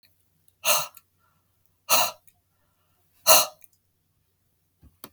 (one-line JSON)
{"exhalation_length": "5.1 s", "exhalation_amplitude": 30649, "exhalation_signal_mean_std_ratio": 0.25, "survey_phase": "beta (2021-08-13 to 2022-03-07)", "age": "45-64", "gender": "Male", "wearing_mask": "No", "symptom_none": true, "smoker_status": "Never smoked", "respiratory_condition_asthma": false, "respiratory_condition_other": false, "recruitment_source": "REACT", "submission_delay": "0 days", "covid_test_result": "Negative", "covid_test_method": "RT-qPCR"}